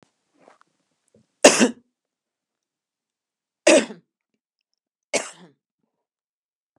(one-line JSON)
{"three_cough_length": "6.8 s", "three_cough_amplitude": 32768, "three_cough_signal_mean_std_ratio": 0.2, "survey_phase": "beta (2021-08-13 to 2022-03-07)", "age": "65+", "gender": "Female", "wearing_mask": "No", "symptom_none": true, "smoker_status": "Ex-smoker", "respiratory_condition_asthma": false, "respiratory_condition_other": false, "recruitment_source": "REACT", "submission_delay": "6 days", "covid_test_result": "Negative", "covid_test_method": "RT-qPCR", "influenza_a_test_result": "Negative", "influenza_b_test_result": "Negative"}